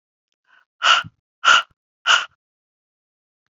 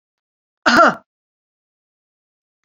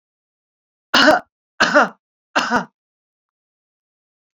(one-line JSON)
{"exhalation_length": "3.5 s", "exhalation_amplitude": 28858, "exhalation_signal_mean_std_ratio": 0.3, "cough_length": "2.6 s", "cough_amplitude": 28583, "cough_signal_mean_std_ratio": 0.25, "three_cough_length": "4.4 s", "three_cough_amplitude": 32750, "three_cough_signal_mean_std_ratio": 0.32, "survey_phase": "beta (2021-08-13 to 2022-03-07)", "age": "45-64", "gender": "Female", "wearing_mask": "No", "symptom_none": true, "smoker_status": "Never smoked", "respiratory_condition_asthma": false, "respiratory_condition_other": false, "recruitment_source": "REACT", "submission_delay": "1 day", "covid_test_result": "Negative", "covid_test_method": "RT-qPCR"}